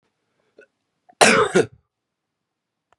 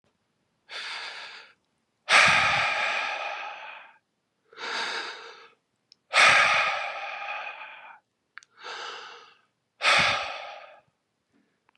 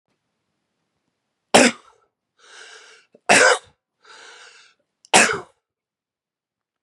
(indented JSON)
{
  "cough_length": "3.0 s",
  "cough_amplitude": 32767,
  "cough_signal_mean_std_ratio": 0.28,
  "exhalation_length": "11.8 s",
  "exhalation_amplitude": 19030,
  "exhalation_signal_mean_std_ratio": 0.44,
  "three_cough_length": "6.8 s",
  "three_cough_amplitude": 32768,
  "three_cough_signal_mean_std_ratio": 0.25,
  "survey_phase": "beta (2021-08-13 to 2022-03-07)",
  "age": "45-64",
  "gender": "Male",
  "wearing_mask": "No",
  "symptom_cough_any": true,
  "symptom_runny_or_blocked_nose": true,
  "symptom_abdominal_pain": true,
  "symptom_fatigue": true,
  "symptom_headache": true,
  "symptom_other": true,
  "smoker_status": "Current smoker (1 to 10 cigarettes per day)",
  "respiratory_condition_asthma": false,
  "respiratory_condition_other": false,
  "recruitment_source": "Test and Trace",
  "submission_delay": "2 days",
  "covid_test_result": "Positive",
  "covid_test_method": "RT-qPCR",
  "covid_ct_value": 28.3,
  "covid_ct_gene": "ORF1ab gene"
}